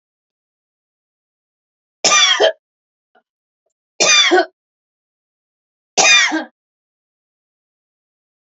{"three_cough_length": "8.4 s", "three_cough_amplitude": 32768, "three_cough_signal_mean_std_ratio": 0.32, "survey_phase": "alpha (2021-03-01 to 2021-08-12)", "age": "65+", "gender": "Female", "wearing_mask": "No", "symptom_none": true, "smoker_status": "Never smoked", "respiratory_condition_asthma": true, "respiratory_condition_other": false, "recruitment_source": "REACT", "submission_delay": "3 days", "covid_test_result": "Negative", "covid_test_method": "RT-qPCR"}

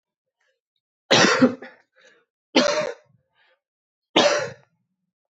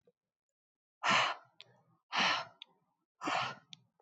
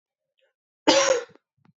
{"three_cough_length": "5.3 s", "three_cough_amplitude": 25171, "three_cough_signal_mean_std_ratio": 0.35, "exhalation_length": "4.0 s", "exhalation_amplitude": 4648, "exhalation_signal_mean_std_ratio": 0.39, "cough_length": "1.8 s", "cough_amplitude": 23968, "cough_signal_mean_std_ratio": 0.35, "survey_phase": "beta (2021-08-13 to 2022-03-07)", "age": "18-44", "gender": "Female", "wearing_mask": "No", "symptom_cough_any": true, "symptom_runny_or_blocked_nose": true, "symptom_sore_throat": true, "symptom_abdominal_pain": true, "symptom_fatigue": true, "symptom_fever_high_temperature": true, "symptom_headache": true, "smoker_status": "Never smoked", "respiratory_condition_asthma": false, "respiratory_condition_other": false, "recruitment_source": "Test and Trace", "submission_delay": "1 day", "covid_test_result": "Positive", "covid_test_method": "RT-qPCR", "covid_ct_value": 22.2, "covid_ct_gene": "N gene"}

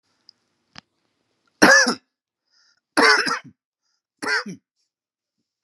{"three_cough_length": "5.6 s", "three_cough_amplitude": 32767, "three_cough_signal_mean_std_ratio": 0.3, "survey_phase": "beta (2021-08-13 to 2022-03-07)", "age": "45-64", "gender": "Male", "wearing_mask": "No", "symptom_none": true, "smoker_status": "Never smoked", "respiratory_condition_asthma": false, "respiratory_condition_other": false, "recruitment_source": "REACT", "submission_delay": "2 days", "covid_test_result": "Negative", "covid_test_method": "RT-qPCR", "influenza_a_test_result": "Negative", "influenza_b_test_result": "Negative"}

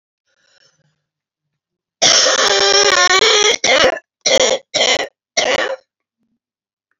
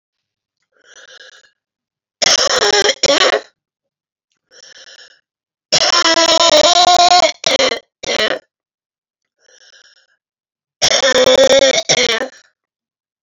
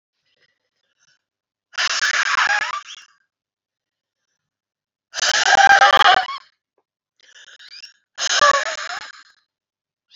{"cough_length": "7.0 s", "cough_amplitude": 32465, "cough_signal_mean_std_ratio": 0.54, "three_cough_length": "13.2 s", "three_cough_amplitude": 32768, "three_cough_signal_mean_std_ratio": 0.48, "exhalation_length": "10.2 s", "exhalation_amplitude": 29441, "exhalation_signal_mean_std_ratio": 0.38, "survey_phase": "beta (2021-08-13 to 2022-03-07)", "age": "45-64", "gender": "Female", "wearing_mask": "No", "symptom_cough_any": true, "symptom_runny_or_blocked_nose": true, "symptom_shortness_of_breath": true, "smoker_status": "Current smoker (e-cigarettes or vapes only)", "respiratory_condition_asthma": true, "respiratory_condition_other": false, "recruitment_source": "REACT", "submission_delay": "2 days", "covid_test_result": "Negative", "covid_test_method": "RT-qPCR"}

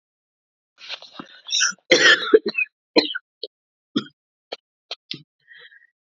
{"cough_length": "6.1 s", "cough_amplitude": 30897, "cough_signal_mean_std_ratio": 0.31, "survey_phase": "beta (2021-08-13 to 2022-03-07)", "age": "18-44", "gender": "Female", "wearing_mask": "No", "symptom_cough_any": true, "symptom_shortness_of_breath": true, "symptom_sore_throat": true, "symptom_fatigue": true, "symptom_change_to_sense_of_smell_or_taste": true, "symptom_onset": "4 days", "smoker_status": "Ex-smoker", "respiratory_condition_asthma": false, "respiratory_condition_other": false, "recruitment_source": "Test and Trace", "submission_delay": "2 days", "covid_test_result": "Positive", "covid_test_method": "ePCR"}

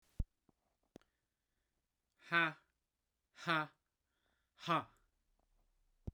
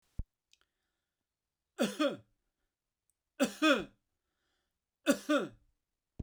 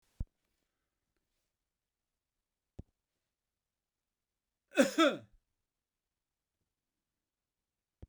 {"exhalation_length": "6.1 s", "exhalation_amplitude": 3518, "exhalation_signal_mean_std_ratio": 0.25, "three_cough_length": "6.2 s", "three_cough_amplitude": 6437, "three_cough_signal_mean_std_ratio": 0.28, "cough_length": "8.1 s", "cough_amplitude": 7267, "cough_signal_mean_std_ratio": 0.15, "survey_phase": "beta (2021-08-13 to 2022-03-07)", "age": "45-64", "gender": "Male", "wearing_mask": "No", "symptom_none": true, "smoker_status": "Never smoked", "respiratory_condition_asthma": false, "respiratory_condition_other": false, "recruitment_source": "REACT", "submission_delay": "1 day", "covid_test_result": "Negative", "covid_test_method": "RT-qPCR"}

